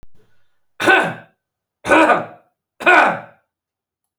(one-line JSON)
{"three_cough_length": "4.2 s", "three_cough_amplitude": 31507, "three_cough_signal_mean_std_ratio": 0.4, "survey_phase": "beta (2021-08-13 to 2022-03-07)", "age": "45-64", "gender": "Female", "wearing_mask": "No", "symptom_cough_any": true, "symptom_runny_or_blocked_nose": true, "symptom_sore_throat": true, "symptom_fatigue": true, "symptom_headache": true, "symptom_change_to_sense_of_smell_or_taste": true, "symptom_loss_of_taste": true, "symptom_onset": "6 days", "smoker_status": "Ex-smoker", "respiratory_condition_asthma": false, "respiratory_condition_other": false, "recruitment_source": "Test and Trace", "submission_delay": "1 day", "covid_test_result": "Positive", "covid_test_method": "RT-qPCR", "covid_ct_value": 23.1, "covid_ct_gene": "ORF1ab gene"}